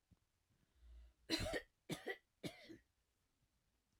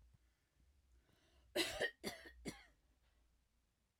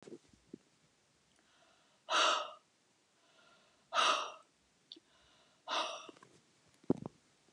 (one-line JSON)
{"three_cough_length": "4.0 s", "three_cough_amplitude": 1508, "three_cough_signal_mean_std_ratio": 0.35, "cough_length": "4.0 s", "cough_amplitude": 1906, "cough_signal_mean_std_ratio": 0.32, "exhalation_length": "7.5 s", "exhalation_amplitude": 4607, "exhalation_signal_mean_std_ratio": 0.31, "survey_phase": "beta (2021-08-13 to 2022-03-07)", "age": "45-64", "gender": "Female", "wearing_mask": "No", "symptom_runny_or_blocked_nose": true, "smoker_status": "Never smoked", "respiratory_condition_asthma": false, "respiratory_condition_other": false, "recruitment_source": "Test and Trace", "submission_delay": "1 day", "covid_test_result": "Negative", "covid_test_method": "LFT"}